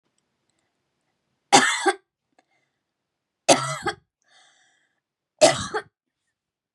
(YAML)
three_cough_length: 6.7 s
three_cough_amplitude: 31666
three_cough_signal_mean_std_ratio: 0.26
survey_phase: beta (2021-08-13 to 2022-03-07)
age: 18-44
gender: Female
wearing_mask: 'No'
symptom_runny_or_blocked_nose: true
symptom_shortness_of_breath: true
symptom_fatigue: true
symptom_headache: true
symptom_onset: 3 days
smoker_status: Ex-smoker
respiratory_condition_asthma: true
respiratory_condition_other: false
recruitment_source: REACT
submission_delay: 1 day
covid_test_result: Negative
covid_test_method: RT-qPCR
influenza_a_test_result: Negative
influenza_b_test_result: Negative